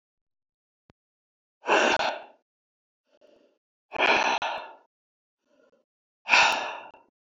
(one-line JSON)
{"exhalation_length": "7.3 s", "exhalation_amplitude": 20871, "exhalation_signal_mean_std_ratio": 0.35, "survey_phase": "beta (2021-08-13 to 2022-03-07)", "age": "45-64", "gender": "Male", "wearing_mask": "No", "symptom_runny_or_blocked_nose": true, "symptom_onset": "10 days", "smoker_status": "Never smoked", "respiratory_condition_asthma": false, "respiratory_condition_other": false, "recruitment_source": "REACT", "submission_delay": "2 days", "covid_test_result": "Negative", "covid_test_method": "RT-qPCR", "influenza_a_test_result": "Negative", "influenza_b_test_result": "Negative"}